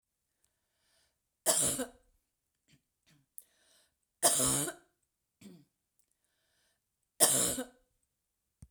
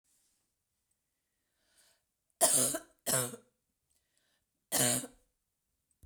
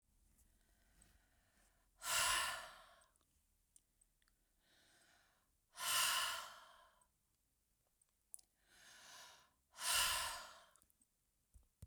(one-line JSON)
{"three_cough_length": "8.7 s", "three_cough_amplitude": 12424, "three_cough_signal_mean_std_ratio": 0.3, "cough_length": "6.1 s", "cough_amplitude": 8696, "cough_signal_mean_std_ratio": 0.3, "exhalation_length": "11.9 s", "exhalation_amplitude": 2136, "exhalation_signal_mean_std_ratio": 0.35, "survey_phase": "beta (2021-08-13 to 2022-03-07)", "age": "65+", "gender": "Female", "wearing_mask": "No", "symptom_cough_any": true, "smoker_status": "Ex-smoker", "respiratory_condition_asthma": false, "respiratory_condition_other": false, "recruitment_source": "REACT", "submission_delay": "2 days", "covid_test_result": "Negative", "covid_test_method": "RT-qPCR", "influenza_a_test_result": "Negative", "influenza_b_test_result": "Negative"}